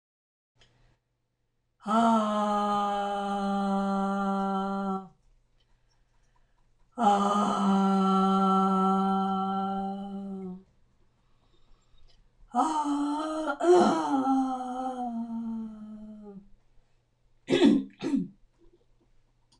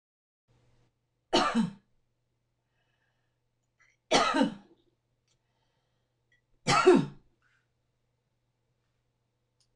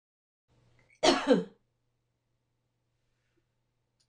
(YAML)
exhalation_length: 19.6 s
exhalation_amplitude: 10151
exhalation_signal_mean_std_ratio: 0.64
three_cough_length: 9.8 s
three_cough_amplitude: 11850
three_cough_signal_mean_std_ratio: 0.26
cough_length: 4.1 s
cough_amplitude: 12370
cough_signal_mean_std_ratio: 0.23
survey_phase: alpha (2021-03-01 to 2021-08-12)
age: 45-64
gender: Female
wearing_mask: 'No'
symptom_fatigue: true
symptom_onset: 8 days
smoker_status: Ex-smoker
respiratory_condition_asthma: true
respiratory_condition_other: false
recruitment_source: REACT
submission_delay: 2 days
covid_test_result: Negative
covid_test_method: RT-qPCR